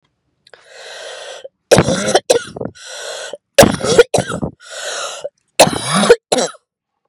three_cough_length: 7.1 s
three_cough_amplitude: 32768
three_cough_signal_mean_std_ratio: 0.43
survey_phase: beta (2021-08-13 to 2022-03-07)
age: 18-44
gender: Female
wearing_mask: 'No'
symptom_cough_any: true
symptom_runny_or_blocked_nose: true
symptom_shortness_of_breath: true
symptom_sore_throat: true
symptom_diarrhoea: true
symptom_fatigue: true
symptom_headache: true
symptom_change_to_sense_of_smell_or_taste: true
symptom_loss_of_taste: true
symptom_onset: 3 days
smoker_status: Current smoker (1 to 10 cigarettes per day)
respiratory_condition_asthma: true
respiratory_condition_other: false
recruitment_source: Test and Trace
submission_delay: 1 day
covid_test_result: Positive
covid_test_method: RT-qPCR
covid_ct_value: 13.6
covid_ct_gene: ORF1ab gene
covid_ct_mean: 13.9
covid_viral_load: 27000000 copies/ml
covid_viral_load_category: High viral load (>1M copies/ml)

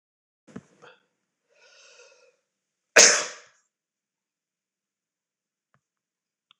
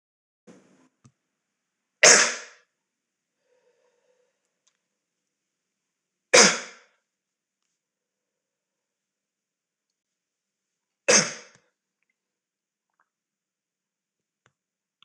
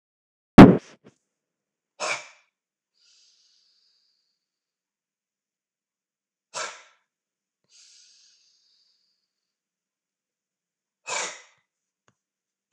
cough_length: 6.6 s
cough_amplitude: 26028
cough_signal_mean_std_ratio: 0.15
three_cough_length: 15.0 s
three_cough_amplitude: 26027
three_cough_signal_mean_std_ratio: 0.16
exhalation_length: 12.7 s
exhalation_amplitude: 26028
exhalation_signal_mean_std_ratio: 0.12
survey_phase: beta (2021-08-13 to 2022-03-07)
age: 45-64
gender: Male
wearing_mask: 'No'
symptom_none: true
smoker_status: Ex-smoker
respiratory_condition_asthma: false
respiratory_condition_other: false
recruitment_source: Test and Trace
submission_delay: 2 days
covid_test_result: Positive
covid_test_method: LFT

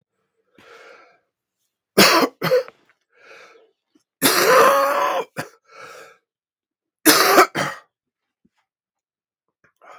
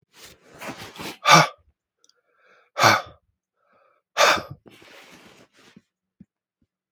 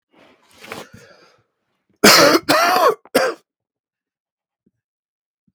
three_cough_length: 10.0 s
three_cough_amplitude: 32768
three_cough_signal_mean_std_ratio: 0.37
exhalation_length: 6.9 s
exhalation_amplitude: 32766
exhalation_signal_mean_std_ratio: 0.26
cough_length: 5.5 s
cough_amplitude: 32768
cough_signal_mean_std_ratio: 0.34
survey_phase: beta (2021-08-13 to 2022-03-07)
age: 45-64
gender: Male
wearing_mask: 'No'
symptom_cough_any: true
symptom_runny_or_blocked_nose: true
symptom_shortness_of_breath: true
symptom_sore_throat: true
symptom_abdominal_pain: true
symptom_fatigue: true
symptom_headache: true
symptom_change_to_sense_of_smell_or_taste: true
symptom_onset: 6 days
smoker_status: Ex-smoker
respiratory_condition_asthma: false
respiratory_condition_other: false
recruitment_source: Test and Trace
submission_delay: 3 days
covid_test_result: Positive
covid_test_method: RT-qPCR
covid_ct_value: 19.7
covid_ct_gene: ORF1ab gene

